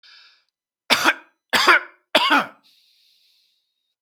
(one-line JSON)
{"three_cough_length": "4.0 s", "three_cough_amplitude": 32768, "three_cough_signal_mean_std_ratio": 0.34, "survey_phase": "beta (2021-08-13 to 2022-03-07)", "age": "45-64", "gender": "Male", "wearing_mask": "No", "symptom_none": true, "smoker_status": "Never smoked", "respiratory_condition_asthma": false, "respiratory_condition_other": false, "recruitment_source": "REACT", "submission_delay": "1 day", "covid_test_result": "Negative", "covid_test_method": "RT-qPCR", "influenza_a_test_result": "Negative", "influenza_b_test_result": "Negative"}